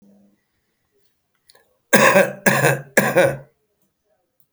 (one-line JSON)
{"three_cough_length": "4.5 s", "three_cough_amplitude": 32768, "three_cough_signal_mean_std_ratio": 0.38, "survey_phase": "alpha (2021-03-01 to 2021-08-12)", "age": "45-64", "gender": "Male", "wearing_mask": "No", "symptom_none": true, "smoker_status": "Current smoker (11 or more cigarettes per day)", "respiratory_condition_asthma": false, "respiratory_condition_other": false, "recruitment_source": "REACT", "submission_delay": "2 days", "covid_test_result": "Negative", "covid_test_method": "RT-qPCR"}